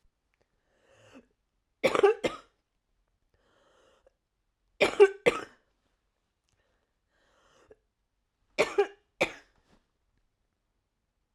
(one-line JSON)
{"three_cough_length": "11.3 s", "three_cough_amplitude": 14282, "three_cough_signal_mean_std_ratio": 0.21, "survey_phase": "alpha (2021-03-01 to 2021-08-12)", "age": "18-44", "gender": "Female", "wearing_mask": "No", "symptom_cough_any": true, "symptom_new_continuous_cough": true, "symptom_fatigue": true, "symptom_headache": true, "symptom_onset": "2 days", "smoker_status": "Never smoked", "respiratory_condition_asthma": true, "respiratory_condition_other": false, "recruitment_source": "Test and Trace", "submission_delay": "1 day", "covid_test_result": "Positive", "covid_test_method": "RT-qPCR", "covid_ct_value": 26.9, "covid_ct_gene": "ORF1ab gene", "covid_ct_mean": 27.8, "covid_viral_load": "790 copies/ml", "covid_viral_load_category": "Minimal viral load (< 10K copies/ml)"}